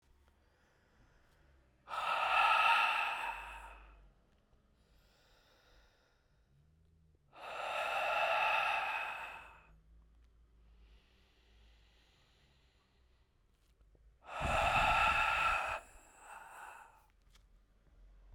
{"exhalation_length": "18.3 s", "exhalation_amplitude": 4705, "exhalation_signal_mean_std_ratio": 0.45, "survey_phase": "beta (2021-08-13 to 2022-03-07)", "age": "45-64", "gender": "Male", "wearing_mask": "No", "symptom_cough_any": true, "symptom_shortness_of_breath": true, "symptom_sore_throat": true, "symptom_fatigue": true, "symptom_headache": true, "symptom_change_to_sense_of_smell_or_taste": true, "smoker_status": "Ex-smoker", "respiratory_condition_asthma": false, "respiratory_condition_other": false, "recruitment_source": "Test and Trace", "submission_delay": "1 day", "covid_test_result": "Positive", "covid_test_method": "RT-qPCR", "covid_ct_value": 19.7, "covid_ct_gene": "ORF1ab gene", "covid_ct_mean": 20.2, "covid_viral_load": "240000 copies/ml", "covid_viral_load_category": "Low viral load (10K-1M copies/ml)"}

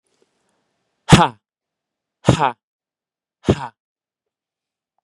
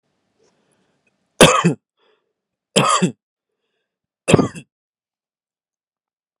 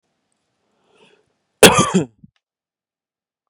{"exhalation_length": "5.0 s", "exhalation_amplitude": 32768, "exhalation_signal_mean_std_ratio": 0.22, "three_cough_length": "6.4 s", "three_cough_amplitude": 32768, "three_cough_signal_mean_std_ratio": 0.26, "cough_length": "3.5 s", "cough_amplitude": 32768, "cough_signal_mean_std_ratio": 0.23, "survey_phase": "beta (2021-08-13 to 2022-03-07)", "age": "18-44", "gender": "Male", "wearing_mask": "No", "symptom_none": true, "symptom_onset": "12 days", "smoker_status": "Never smoked", "respiratory_condition_asthma": false, "respiratory_condition_other": false, "recruitment_source": "REACT", "submission_delay": "1 day", "covid_test_result": "Negative", "covid_test_method": "RT-qPCR", "influenza_a_test_result": "Negative", "influenza_b_test_result": "Negative"}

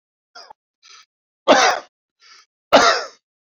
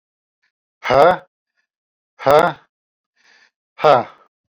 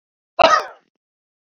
{"three_cough_length": "3.5 s", "three_cough_amplitude": 32768, "three_cough_signal_mean_std_ratio": 0.33, "exhalation_length": "4.5 s", "exhalation_amplitude": 29792, "exhalation_signal_mean_std_ratio": 0.3, "cough_length": "1.5 s", "cough_amplitude": 27323, "cough_signal_mean_std_ratio": 0.31, "survey_phase": "beta (2021-08-13 to 2022-03-07)", "age": "45-64", "gender": "Male", "wearing_mask": "No", "symptom_runny_or_blocked_nose": true, "symptom_onset": "9 days", "smoker_status": "Never smoked", "respiratory_condition_asthma": false, "respiratory_condition_other": false, "recruitment_source": "REACT", "submission_delay": "1 day", "covid_test_result": "Negative", "covid_test_method": "RT-qPCR"}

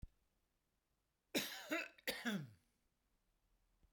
{"cough_length": "3.9 s", "cough_amplitude": 1723, "cough_signal_mean_std_ratio": 0.37, "survey_phase": "beta (2021-08-13 to 2022-03-07)", "age": "65+", "gender": "Male", "wearing_mask": "No", "symptom_none": true, "smoker_status": "Ex-smoker", "respiratory_condition_asthma": false, "respiratory_condition_other": false, "recruitment_source": "REACT", "submission_delay": "1 day", "covid_test_result": "Negative", "covid_test_method": "RT-qPCR"}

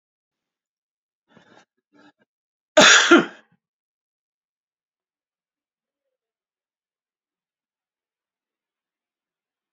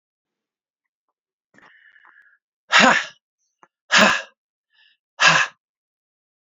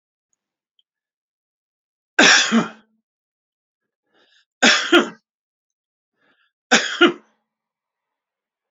{"cough_length": "9.7 s", "cough_amplitude": 29913, "cough_signal_mean_std_ratio": 0.17, "exhalation_length": "6.5 s", "exhalation_amplitude": 29931, "exhalation_signal_mean_std_ratio": 0.28, "three_cough_length": "8.7 s", "three_cough_amplitude": 30323, "three_cough_signal_mean_std_ratio": 0.28, "survey_phase": "beta (2021-08-13 to 2022-03-07)", "age": "65+", "gender": "Male", "wearing_mask": "No", "symptom_none": true, "smoker_status": "Ex-smoker", "respiratory_condition_asthma": false, "respiratory_condition_other": false, "recruitment_source": "REACT", "submission_delay": "5 days", "covid_test_result": "Negative", "covid_test_method": "RT-qPCR", "influenza_a_test_result": "Negative", "influenza_b_test_result": "Negative"}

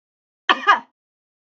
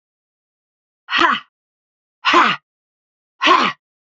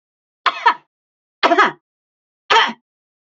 {"cough_length": "1.5 s", "cough_amplitude": 31850, "cough_signal_mean_std_ratio": 0.26, "exhalation_length": "4.2 s", "exhalation_amplitude": 28068, "exhalation_signal_mean_std_ratio": 0.36, "three_cough_length": "3.2 s", "three_cough_amplitude": 29256, "three_cough_signal_mean_std_ratio": 0.34, "survey_phase": "beta (2021-08-13 to 2022-03-07)", "age": "45-64", "gender": "Female", "wearing_mask": "No", "symptom_none": true, "smoker_status": "Never smoked", "respiratory_condition_asthma": false, "respiratory_condition_other": false, "recruitment_source": "REACT", "submission_delay": "1 day", "covid_test_result": "Negative", "covid_test_method": "RT-qPCR", "influenza_a_test_result": "Negative", "influenza_b_test_result": "Negative"}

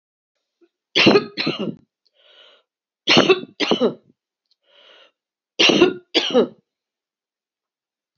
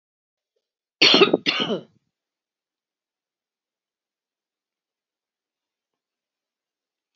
{"three_cough_length": "8.2 s", "three_cough_amplitude": 32768, "three_cough_signal_mean_std_ratio": 0.35, "cough_length": "7.2 s", "cough_amplitude": 27401, "cough_signal_mean_std_ratio": 0.2, "survey_phase": "alpha (2021-03-01 to 2021-08-12)", "age": "65+", "gender": "Female", "wearing_mask": "No", "symptom_cough_any": true, "symptom_fatigue": true, "symptom_onset": "5 days", "smoker_status": "Never smoked", "respiratory_condition_asthma": false, "respiratory_condition_other": false, "recruitment_source": "Test and Trace", "submission_delay": "2 days", "covid_test_result": "Positive", "covid_test_method": "ePCR"}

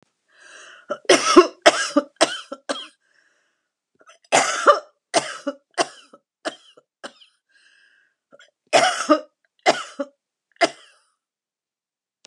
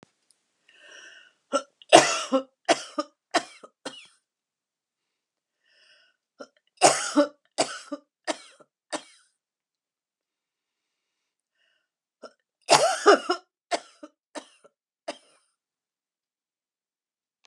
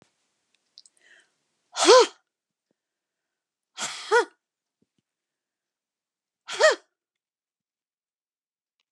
{"cough_length": "12.3 s", "cough_amplitude": 32768, "cough_signal_mean_std_ratio": 0.3, "three_cough_length": "17.5 s", "three_cough_amplitude": 32768, "three_cough_signal_mean_std_ratio": 0.23, "exhalation_length": "8.9 s", "exhalation_amplitude": 26962, "exhalation_signal_mean_std_ratio": 0.21, "survey_phase": "beta (2021-08-13 to 2022-03-07)", "age": "65+", "gender": "Female", "wearing_mask": "No", "symptom_cough_any": true, "symptom_fatigue": true, "symptom_headache": true, "symptom_onset": "12 days", "smoker_status": "Never smoked", "respiratory_condition_asthma": false, "respiratory_condition_other": false, "recruitment_source": "REACT", "submission_delay": "1 day", "covid_test_result": "Negative", "covid_test_method": "RT-qPCR"}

